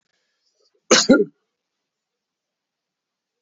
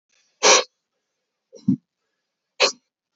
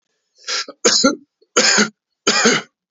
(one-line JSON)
{"cough_length": "3.4 s", "cough_amplitude": 29942, "cough_signal_mean_std_ratio": 0.23, "exhalation_length": "3.2 s", "exhalation_amplitude": 29740, "exhalation_signal_mean_std_ratio": 0.27, "three_cough_length": "2.9 s", "three_cough_amplitude": 32107, "three_cough_signal_mean_std_ratio": 0.51, "survey_phase": "beta (2021-08-13 to 2022-03-07)", "age": "45-64", "gender": "Male", "wearing_mask": "No", "symptom_none": true, "smoker_status": "Ex-smoker", "respiratory_condition_asthma": false, "respiratory_condition_other": false, "recruitment_source": "REACT", "submission_delay": "7 days", "covid_test_result": "Negative", "covid_test_method": "RT-qPCR", "influenza_a_test_result": "Negative", "influenza_b_test_result": "Negative"}